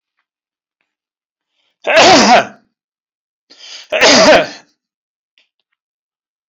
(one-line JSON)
{"cough_length": "6.5 s", "cough_amplitude": 32768, "cough_signal_mean_std_ratio": 0.37, "survey_phase": "beta (2021-08-13 to 2022-03-07)", "age": "45-64", "gender": "Male", "wearing_mask": "No", "symptom_none": true, "smoker_status": "Never smoked", "respiratory_condition_asthma": false, "respiratory_condition_other": false, "recruitment_source": "REACT", "submission_delay": "1 day", "covid_test_result": "Negative", "covid_test_method": "RT-qPCR"}